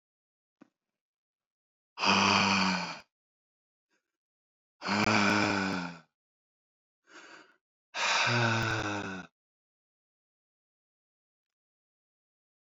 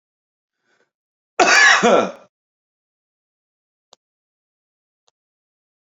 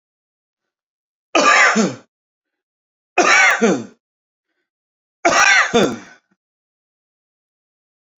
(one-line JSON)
{"exhalation_length": "12.6 s", "exhalation_amplitude": 9656, "exhalation_signal_mean_std_ratio": 0.41, "cough_length": "5.9 s", "cough_amplitude": 29677, "cough_signal_mean_std_ratio": 0.27, "three_cough_length": "8.2 s", "three_cough_amplitude": 31713, "three_cough_signal_mean_std_ratio": 0.39, "survey_phase": "beta (2021-08-13 to 2022-03-07)", "age": "45-64", "gender": "Male", "wearing_mask": "No", "symptom_none": true, "smoker_status": "Ex-smoker", "respiratory_condition_asthma": false, "respiratory_condition_other": false, "recruitment_source": "REACT", "submission_delay": "-1 day", "covid_test_result": "Negative", "covid_test_method": "RT-qPCR", "influenza_a_test_result": "Negative", "influenza_b_test_result": "Negative"}